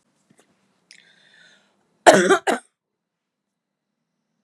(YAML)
cough_length: 4.4 s
cough_amplitude: 32768
cough_signal_mean_std_ratio: 0.22
survey_phase: alpha (2021-03-01 to 2021-08-12)
age: 18-44
gender: Female
wearing_mask: 'No'
symptom_fatigue: true
symptom_headache: true
symptom_onset: 12 days
smoker_status: Ex-smoker
respiratory_condition_asthma: false
respiratory_condition_other: false
recruitment_source: REACT
submission_delay: 1 day
covid_test_result: Negative
covid_test_method: RT-qPCR